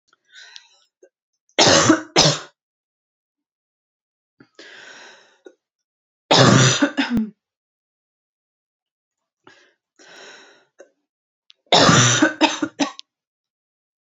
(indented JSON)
{
  "three_cough_length": "14.2 s",
  "three_cough_amplitude": 32007,
  "three_cough_signal_mean_std_ratio": 0.33,
  "survey_phase": "alpha (2021-03-01 to 2021-08-12)",
  "age": "18-44",
  "gender": "Female",
  "wearing_mask": "No",
  "symptom_cough_any": true,
  "symptom_new_continuous_cough": true,
  "symptom_fatigue": true,
  "symptom_onset": "4 days",
  "smoker_status": "Never smoked",
  "respiratory_condition_asthma": false,
  "respiratory_condition_other": false,
  "recruitment_source": "Test and Trace",
  "submission_delay": "1 day",
  "covid_test_result": "Positive",
  "covid_test_method": "RT-qPCR",
  "covid_ct_value": 29.8,
  "covid_ct_gene": "ORF1ab gene"
}